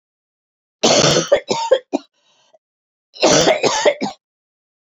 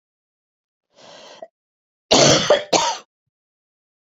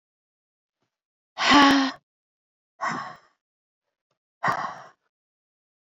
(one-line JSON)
{"three_cough_length": "4.9 s", "three_cough_amplitude": 32767, "three_cough_signal_mean_std_ratio": 0.46, "cough_length": "4.1 s", "cough_amplitude": 28920, "cough_signal_mean_std_ratio": 0.33, "exhalation_length": "5.8 s", "exhalation_amplitude": 22709, "exhalation_signal_mean_std_ratio": 0.3, "survey_phase": "beta (2021-08-13 to 2022-03-07)", "age": "45-64", "gender": "Female", "wearing_mask": "No", "symptom_cough_any": true, "symptom_new_continuous_cough": true, "symptom_runny_or_blocked_nose": true, "symptom_sore_throat": true, "symptom_fatigue": true, "symptom_fever_high_temperature": true, "symptom_headache": true, "symptom_change_to_sense_of_smell_or_taste": true, "symptom_loss_of_taste": true, "symptom_onset": "5 days", "smoker_status": "Never smoked", "respiratory_condition_asthma": false, "respiratory_condition_other": false, "recruitment_source": "Test and Trace", "submission_delay": "2 days", "covid_test_result": "Positive", "covid_test_method": "RT-qPCR", "covid_ct_value": 14.9, "covid_ct_gene": "ORF1ab gene", "covid_ct_mean": 15.2, "covid_viral_load": "11000000 copies/ml", "covid_viral_load_category": "High viral load (>1M copies/ml)"}